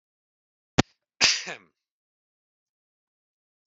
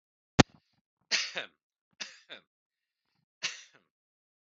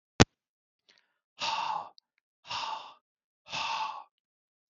{"cough_length": "3.7 s", "cough_amplitude": 32768, "cough_signal_mean_std_ratio": 0.18, "three_cough_length": "4.5 s", "three_cough_amplitude": 32768, "three_cough_signal_mean_std_ratio": 0.16, "exhalation_length": "4.7 s", "exhalation_amplitude": 32768, "exhalation_signal_mean_std_ratio": 0.29, "survey_phase": "beta (2021-08-13 to 2022-03-07)", "age": "45-64", "gender": "Male", "wearing_mask": "No", "symptom_none": true, "smoker_status": "Never smoked", "respiratory_condition_asthma": false, "respiratory_condition_other": false, "recruitment_source": "REACT", "submission_delay": "2 days", "covid_test_result": "Negative", "covid_test_method": "RT-qPCR", "influenza_a_test_result": "Negative", "influenza_b_test_result": "Negative"}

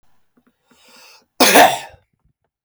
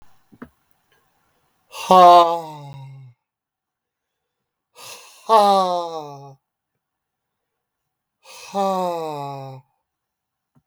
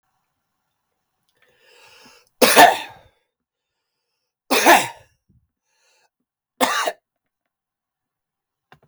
{"cough_length": "2.6 s", "cough_amplitude": 32768, "cough_signal_mean_std_ratio": 0.3, "exhalation_length": "10.7 s", "exhalation_amplitude": 32766, "exhalation_signal_mean_std_ratio": 0.31, "three_cough_length": "8.9 s", "three_cough_amplitude": 32768, "three_cough_signal_mean_std_ratio": 0.24, "survey_phase": "beta (2021-08-13 to 2022-03-07)", "age": "45-64", "gender": "Male", "wearing_mask": "No", "symptom_none": true, "smoker_status": "Never smoked", "respiratory_condition_asthma": false, "respiratory_condition_other": false, "recruitment_source": "REACT", "submission_delay": "2 days", "covid_test_result": "Negative", "covid_test_method": "RT-qPCR", "influenza_a_test_result": "Negative", "influenza_b_test_result": "Negative"}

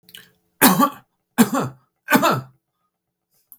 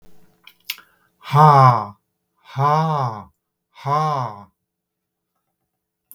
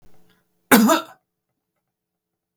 {"three_cough_length": "3.6 s", "three_cough_amplitude": 32768, "three_cough_signal_mean_std_ratio": 0.38, "exhalation_length": "6.1 s", "exhalation_amplitude": 32130, "exhalation_signal_mean_std_ratio": 0.39, "cough_length": "2.6 s", "cough_amplitude": 32768, "cough_signal_mean_std_ratio": 0.28, "survey_phase": "beta (2021-08-13 to 2022-03-07)", "age": "65+", "gender": "Male", "wearing_mask": "No", "symptom_cough_any": true, "smoker_status": "Never smoked", "respiratory_condition_asthma": false, "respiratory_condition_other": false, "recruitment_source": "REACT", "submission_delay": "2 days", "covid_test_result": "Negative", "covid_test_method": "RT-qPCR", "influenza_a_test_result": "Negative", "influenza_b_test_result": "Negative"}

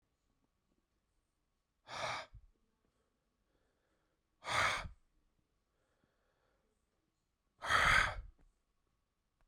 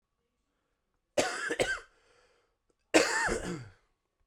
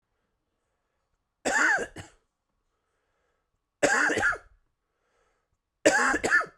{"exhalation_length": "9.5 s", "exhalation_amplitude": 4581, "exhalation_signal_mean_std_ratio": 0.27, "cough_length": "4.3 s", "cough_amplitude": 13773, "cough_signal_mean_std_ratio": 0.39, "three_cough_length": "6.6 s", "three_cough_amplitude": 14451, "three_cough_signal_mean_std_ratio": 0.39, "survey_phase": "beta (2021-08-13 to 2022-03-07)", "age": "45-64", "gender": "Male", "wearing_mask": "No", "symptom_cough_any": true, "symptom_new_continuous_cough": true, "symptom_runny_or_blocked_nose": true, "symptom_shortness_of_breath": true, "symptom_fatigue": true, "symptom_headache": true, "symptom_change_to_sense_of_smell_or_taste": true, "symptom_loss_of_taste": true, "symptom_onset": "4 days", "smoker_status": "Never smoked", "respiratory_condition_asthma": false, "respiratory_condition_other": false, "recruitment_source": "Test and Trace", "submission_delay": "1 day", "covid_test_result": "Positive", "covid_test_method": "RT-qPCR"}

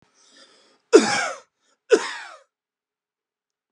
{"cough_length": "3.7 s", "cough_amplitude": 31643, "cough_signal_mean_std_ratio": 0.25, "survey_phase": "alpha (2021-03-01 to 2021-08-12)", "age": "18-44", "gender": "Male", "wearing_mask": "No", "symptom_none": true, "smoker_status": "Never smoked", "respiratory_condition_asthma": false, "respiratory_condition_other": false, "recruitment_source": "REACT", "submission_delay": "1 day", "covid_test_result": "Negative", "covid_test_method": "RT-qPCR"}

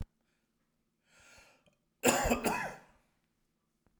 {"cough_length": "4.0 s", "cough_amplitude": 9696, "cough_signal_mean_std_ratio": 0.32, "survey_phase": "alpha (2021-03-01 to 2021-08-12)", "age": "65+", "gender": "Male", "wearing_mask": "No", "symptom_none": true, "smoker_status": "Never smoked", "respiratory_condition_asthma": false, "respiratory_condition_other": false, "recruitment_source": "REACT", "submission_delay": "2 days", "covid_test_result": "Negative", "covid_test_method": "RT-qPCR"}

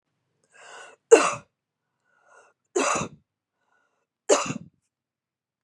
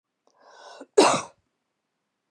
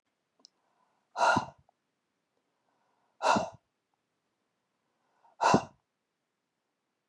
{"three_cough_length": "5.6 s", "three_cough_amplitude": 30088, "three_cough_signal_mean_std_ratio": 0.24, "cough_length": "2.3 s", "cough_amplitude": 18463, "cough_signal_mean_std_ratio": 0.25, "exhalation_length": "7.1 s", "exhalation_amplitude": 12678, "exhalation_signal_mean_std_ratio": 0.25, "survey_phase": "beta (2021-08-13 to 2022-03-07)", "age": "45-64", "gender": "Female", "wearing_mask": "No", "symptom_none": true, "smoker_status": "Ex-smoker", "respiratory_condition_asthma": false, "respiratory_condition_other": false, "recruitment_source": "REACT", "submission_delay": "1 day", "covid_test_result": "Negative", "covid_test_method": "RT-qPCR", "influenza_a_test_result": "Negative", "influenza_b_test_result": "Negative"}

